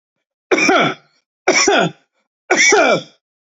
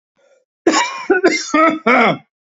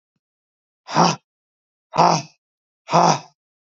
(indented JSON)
{
  "three_cough_length": "3.5 s",
  "three_cough_amplitude": 32370,
  "three_cough_signal_mean_std_ratio": 0.54,
  "cough_length": "2.6 s",
  "cough_amplitude": 29652,
  "cough_signal_mean_std_ratio": 0.58,
  "exhalation_length": "3.8 s",
  "exhalation_amplitude": 32768,
  "exhalation_signal_mean_std_ratio": 0.33,
  "survey_phase": "beta (2021-08-13 to 2022-03-07)",
  "age": "45-64",
  "gender": "Male",
  "wearing_mask": "No",
  "symptom_none": true,
  "symptom_onset": "5 days",
  "smoker_status": "Never smoked",
  "respiratory_condition_asthma": false,
  "respiratory_condition_other": false,
  "recruitment_source": "REACT",
  "submission_delay": "1 day",
  "covid_test_result": "Negative",
  "covid_test_method": "RT-qPCR"
}